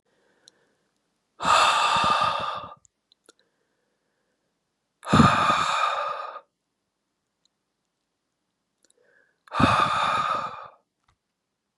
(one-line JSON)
{"exhalation_length": "11.8 s", "exhalation_amplitude": 23146, "exhalation_signal_mean_std_ratio": 0.42, "survey_phase": "beta (2021-08-13 to 2022-03-07)", "age": "18-44", "gender": "Male", "wearing_mask": "No", "symptom_cough_any": true, "symptom_runny_or_blocked_nose": true, "symptom_sore_throat": true, "symptom_fatigue": true, "symptom_onset": "4 days", "smoker_status": "Never smoked", "respiratory_condition_asthma": false, "respiratory_condition_other": false, "recruitment_source": "Test and Trace", "submission_delay": "2 days", "covid_test_result": "Negative", "covid_test_method": "RT-qPCR"}